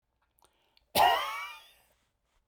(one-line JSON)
{"cough_length": "2.5 s", "cough_amplitude": 8934, "cough_signal_mean_std_ratio": 0.33, "survey_phase": "beta (2021-08-13 to 2022-03-07)", "age": "45-64", "gender": "Male", "wearing_mask": "No", "symptom_none": true, "smoker_status": "Never smoked", "respiratory_condition_asthma": false, "respiratory_condition_other": false, "recruitment_source": "REACT", "submission_delay": "2 days", "covid_test_result": "Negative", "covid_test_method": "RT-qPCR"}